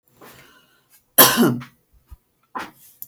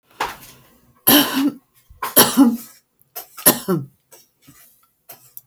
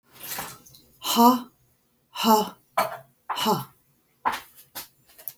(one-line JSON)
{"cough_length": "3.1 s", "cough_amplitude": 32768, "cough_signal_mean_std_ratio": 0.29, "three_cough_length": "5.5 s", "three_cough_amplitude": 32768, "three_cough_signal_mean_std_ratio": 0.37, "exhalation_length": "5.4 s", "exhalation_amplitude": 21057, "exhalation_signal_mean_std_ratio": 0.39, "survey_phase": "beta (2021-08-13 to 2022-03-07)", "age": "45-64", "gender": "Female", "wearing_mask": "No", "symptom_none": true, "smoker_status": "Ex-smoker", "respiratory_condition_asthma": false, "respiratory_condition_other": false, "recruitment_source": "REACT", "submission_delay": "1 day", "covid_test_result": "Negative", "covid_test_method": "RT-qPCR", "influenza_a_test_result": "Negative", "influenza_b_test_result": "Negative"}